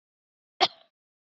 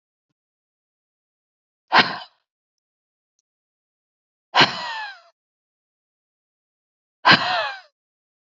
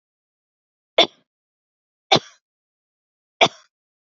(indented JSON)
{
  "cough_length": "1.3 s",
  "cough_amplitude": 12941,
  "cough_signal_mean_std_ratio": 0.17,
  "exhalation_length": "8.5 s",
  "exhalation_amplitude": 32760,
  "exhalation_signal_mean_std_ratio": 0.23,
  "three_cough_length": "4.0 s",
  "three_cough_amplitude": 30021,
  "three_cough_signal_mean_std_ratio": 0.18,
  "survey_phase": "beta (2021-08-13 to 2022-03-07)",
  "age": "45-64",
  "gender": "Female",
  "wearing_mask": "No",
  "symptom_none": true,
  "symptom_onset": "7 days",
  "smoker_status": "Ex-smoker",
  "respiratory_condition_asthma": false,
  "respiratory_condition_other": false,
  "recruitment_source": "REACT",
  "submission_delay": "1 day",
  "covid_test_result": "Negative",
  "covid_test_method": "RT-qPCR",
  "influenza_a_test_result": "Negative",
  "influenza_b_test_result": "Negative"
}